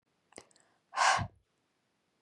{"exhalation_length": "2.2 s", "exhalation_amplitude": 6292, "exhalation_signal_mean_std_ratio": 0.29, "survey_phase": "beta (2021-08-13 to 2022-03-07)", "age": "18-44", "gender": "Female", "wearing_mask": "No", "symptom_abdominal_pain": true, "symptom_fatigue": true, "symptom_headache": true, "symptom_onset": "7 days", "smoker_status": "Never smoked", "respiratory_condition_asthma": false, "respiratory_condition_other": false, "recruitment_source": "REACT", "submission_delay": "3 days", "covid_test_result": "Negative", "covid_test_method": "RT-qPCR"}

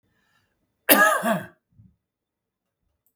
{"cough_length": "3.2 s", "cough_amplitude": 32768, "cough_signal_mean_std_ratio": 0.3, "survey_phase": "beta (2021-08-13 to 2022-03-07)", "age": "65+", "gender": "Male", "wearing_mask": "No", "symptom_none": true, "smoker_status": "Ex-smoker", "respiratory_condition_asthma": false, "respiratory_condition_other": false, "recruitment_source": "REACT", "submission_delay": "2 days", "covid_test_result": "Negative", "covid_test_method": "RT-qPCR", "influenza_a_test_result": "Negative", "influenza_b_test_result": "Negative"}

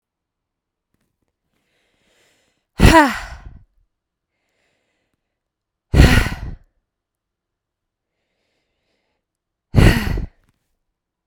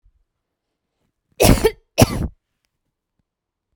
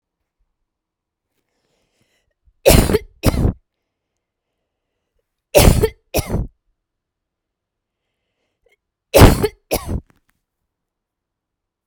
{"exhalation_length": "11.3 s", "exhalation_amplitude": 32768, "exhalation_signal_mean_std_ratio": 0.24, "cough_length": "3.8 s", "cough_amplitude": 32768, "cough_signal_mean_std_ratio": 0.26, "three_cough_length": "11.9 s", "three_cough_amplitude": 32768, "three_cough_signal_mean_std_ratio": 0.26, "survey_phase": "beta (2021-08-13 to 2022-03-07)", "age": "45-64", "gender": "Female", "wearing_mask": "No", "symptom_runny_or_blocked_nose": true, "symptom_shortness_of_breath": true, "symptom_fever_high_temperature": true, "symptom_headache": true, "symptom_onset": "12 days", "smoker_status": "Ex-smoker", "respiratory_condition_asthma": false, "respiratory_condition_other": false, "recruitment_source": "REACT", "submission_delay": "3 days", "covid_test_result": "Negative", "covid_test_method": "RT-qPCR"}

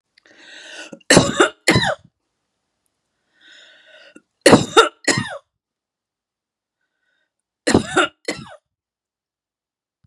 {"three_cough_length": "10.1 s", "three_cough_amplitude": 32768, "three_cough_signal_mean_std_ratio": 0.28, "survey_phase": "beta (2021-08-13 to 2022-03-07)", "age": "45-64", "gender": "Female", "wearing_mask": "No", "symptom_runny_or_blocked_nose": true, "symptom_onset": "8 days", "smoker_status": "Never smoked", "respiratory_condition_asthma": false, "respiratory_condition_other": false, "recruitment_source": "REACT", "submission_delay": "3 days", "covid_test_result": "Negative", "covid_test_method": "RT-qPCR", "influenza_a_test_result": "Negative", "influenza_b_test_result": "Negative"}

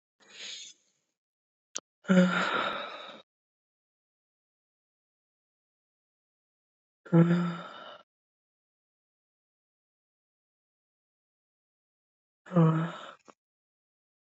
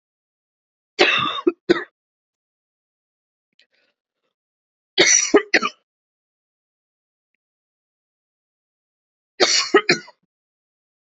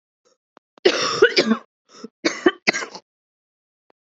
{"exhalation_length": "14.3 s", "exhalation_amplitude": 11101, "exhalation_signal_mean_std_ratio": 0.26, "three_cough_length": "11.0 s", "three_cough_amplitude": 30901, "three_cough_signal_mean_std_ratio": 0.27, "cough_length": "4.1 s", "cough_amplitude": 32767, "cough_signal_mean_std_ratio": 0.34, "survey_phase": "beta (2021-08-13 to 2022-03-07)", "age": "18-44", "gender": "Female", "wearing_mask": "No", "symptom_cough_any": true, "symptom_runny_or_blocked_nose": true, "symptom_sore_throat": true, "symptom_fever_high_temperature": true, "symptom_onset": "4 days", "smoker_status": "Never smoked", "respiratory_condition_asthma": false, "respiratory_condition_other": false, "recruitment_source": "Test and Trace", "submission_delay": "1 day", "covid_test_result": "Positive", "covid_test_method": "ePCR"}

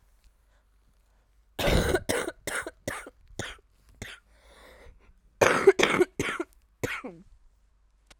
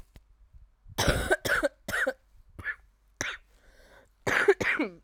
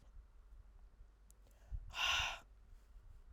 {"cough_length": "8.2 s", "cough_amplitude": 25033, "cough_signal_mean_std_ratio": 0.35, "three_cough_length": "5.0 s", "three_cough_amplitude": 13496, "three_cough_signal_mean_std_ratio": 0.46, "exhalation_length": "3.3 s", "exhalation_amplitude": 1725, "exhalation_signal_mean_std_ratio": 0.48, "survey_phase": "alpha (2021-03-01 to 2021-08-12)", "age": "18-44", "gender": "Female", "wearing_mask": "No", "symptom_cough_any": true, "symptom_new_continuous_cough": true, "symptom_shortness_of_breath": true, "symptom_abdominal_pain": true, "symptom_fatigue": true, "symptom_fever_high_temperature": true, "symptom_headache": true, "symptom_change_to_sense_of_smell_or_taste": true, "symptom_loss_of_taste": true, "symptom_onset": "3 days", "smoker_status": "Ex-smoker", "respiratory_condition_asthma": false, "respiratory_condition_other": false, "recruitment_source": "Test and Trace", "submission_delay": "2 days", "covid_test_result": "Positive", "covid_test_method": "RT-qPCR", "covid_ct_value": 17.3, "covid_ct_gene": "N gene"}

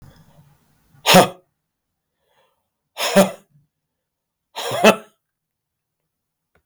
{"exhalation_length": "6.7 s", "exhalation_amplitude": 32766, "exhalation_signal_mean_std_ratio": 0.25, "survey_phase": "beta (2021-08-13 to 2022-03-07)", "age": "45-64", "gender": "Male", "wearing_mask": "No", "symptom_cough_any": true, "symptom_runny_or_blocked_nose": true, "symptom_sore_throat": true, "symptom_fatigue": true, "symptom_headache": true, "symptom_other": true, "smoker_status": "Never smoked", "respiratory_condition_asthma": false, "respiratory_condition_other": false, "recruitment_source": "Test and Trace", "submission_delay": "2 days", "covid_test_result": "Positive", "covid_test_method": "LFT"}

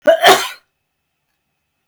{"cough_length": "1.9 s", "cough_amplitude": 32768, "cough_signal_mean_std_ratio": 0.35, "survey_phase": "beta (2021-08-13 to 2022-03-07)", "age": "65+", "gender": "Female", "wearing_mask": "No", "symptom_none": true, "smoker_status": "Never smoked", "respiratory_condition_asthma": false, "respiratory_condition_other": false, "recruitment_source": "REACT", "submission_delay": "1 day", "covid_test_result": "Negative", "covid_test_method": "RT-qPCR", "influenza_a_test_result": "Negative", "influenza_b_test_result": "Negative"}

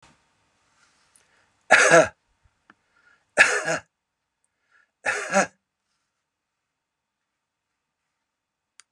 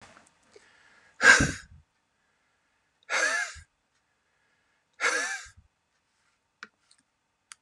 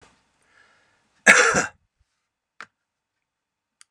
{"three_cough_length": "8.9 s", "three_cough_amplitude": 28648, "three_cough_signal_mean_std_ratio": 0.24, "exhalation_length": "7.6 s", "exhalation_amplitude": 27010, "exhalation_signal_mean_std_ratio": 0.26, "cough_length": "3.9 s", "cough_amplitude": 32768, "cough_signal_mean_std_ratio": 0.23, "survey_phase": "beta (2021-08-13 to 2022-03-07)", "age": "65+", "gender": "Male", "wearing_mask": "No", "symptom_none": true, "smoker_status": "Ex-smoker", "respiratory_condition_asthma": false, "respiratory_condition_other": false, "recruitment_source": "REACT", "submission_delay": "1 day", "covid_test_result": "Negative", "covid_test_method": "RT-qPCR"}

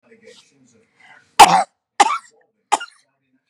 {"three_cough_length": "3.5 s", "three_cough_amplitude": 32768, "three_cough_signal_mean_std_ratio": 0.25, "survey_phase": "beta (2021-08-13 to 2022-03-07)", "age": "45-64", "gender": "Female", "wearing_mask": "No", "symptom_none": true, "smoker_status": "Never smoked", "respiratory_condition_asthma": false, "respiratory_condition_other": false, "recruitment_source": "REACT", "submission_delay": "1 day", "covid_test_result": "Negative", "covid_test_method": "RT-qPCR", "influenza_a_test_result": "Negative", "influenza_b_test_result": "Negative"}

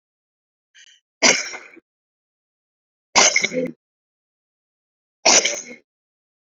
{"three_cough_length": "6.6 s", "three_cough_amplitude": 32768, "three_cough_signal_mean_std_ratio": 0.29, "survey_phase": "beta (2021-08-13 to 2022-03-07)", "age": "45-64", "gender": "Female", "wearing_mask": "No", "symptom_cough_any": true, "symptom_runny_or_blocked_nose": true, "symptom_shortness_of_breath": true, "symptom_diarrhoea": true, "symptom_fatigue": true, "symptom_fever_high_temperature": true, "symptom_change_to_sense_of_smell_or_taste": true, "symptom_loss_of_taste": true, "smoker_status": "Current smoker (1 to 10 cigarettes per day)", "respiratory_condition_asthma": false, "respiratory_condition_other": false, "recruitment_source": "Test and Trace", "submission_delay": "2 days", "covid_test_result": "Positive", "covid_test_method": "RT-qPCR", "covid_ct_value": 16.4, "covid_ct_gene": "ORF1ab gene", "covid_ct_mean": 16.8, "covid_viral_load": "3000000 copies/ml", "covid_viral_load_category": "High viral load (>1M copies/ml)"}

